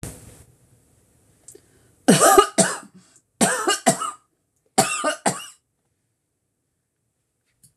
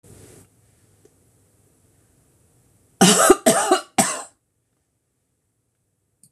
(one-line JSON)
{"three_cough_length": "7.8 s", "three_cough_amplitude": 26028, "three_cough_signal_mean_std_ratio": 0.33, "cough_length": "6.3 s", "cough_amplitude": 26028, "cough_signal_mean_std_ratio": 0.28, "survey_phase": "beta (2021-08-13 to 2022-03-07)", "age": "65+", "gender": "Female", "wearing_mask": "No", "symptom_none": true, "smoker_status": "Never smoked", "respiratory_condition_asthma": false, "respiratory_condition_other": false, "recruitment_source": "REACT", "submission_delay": "2 days", "covid_test_result": "Negative", "covid_test_method": "RT-qPCR", "influenza_a_test_result": "Negative", "influenza_b_test_result": "Negative"}